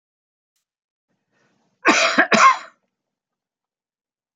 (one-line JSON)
{"cough_length": "4.4 s", "cough_amplitude": 29292, "cough_signal_mean_std_ratio": 0.29, "survey_phase": "alpha (2021-03-01 to 2021-08-12)", "age": "65+", "gender": "Male", "wearing_mask": "No", "symptom_none": true, "smoker_status": "Never smoked", "respiratory_condition_asthma": false, "respiratory_condition_other": false, "recruitment_source": "REACT", "submission_delay": "3 days", "covid_test_result": "Negative", "covid_test_method": "RT-qPCR"}